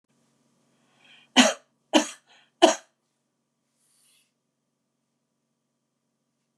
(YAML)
three_cough_length: 6.6 s
three_cough_amplitude: 26701
three_cough_signal_mean_std_ratio: 0.18
survey_phase: beta (2021-08-13 to 2022-03-07)
age: 45-64
gender: Female
wearing_mask: 'No'
symptom_none: true
smoker_status: Never smoked
respiratory_condition_asthma: false
respiratory_condition_other: false
recruitment_source: REACT
submission_delay: 1 day
covid_test_result: Negative
covid_test_method: RT-qPCR
influenza_a_test_result: Negative
influenza_b_test_result: Negative